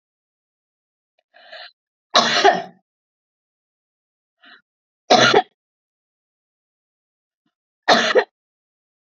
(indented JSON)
{
  "three_cough_length": "9.0 s",
  "three_cough_amplitude": 31798,
  "three_cough_signal_mean_std_ratio": 0.27,
  "survey_phase": "beta (2021-08-13 to 2022-03-07)",
  "age": "45-64",
  "gender": "Female",
  "wearing_mask": "No",
  "symptom_none": true,
  "smoker_status": "Never smoked",
  "respiratory_condition_asthma": false,
  "respiratory_condition_other": false,
  "recruitment_source": "REACT",
  "submission_delay": "5 days",
  "covid_test_result": "Negative",
  "covid_test_method": "RT-qPCR",
  "influenza_a_test_result": "Negative",
  "influenza_b_test_result": "Negative"
}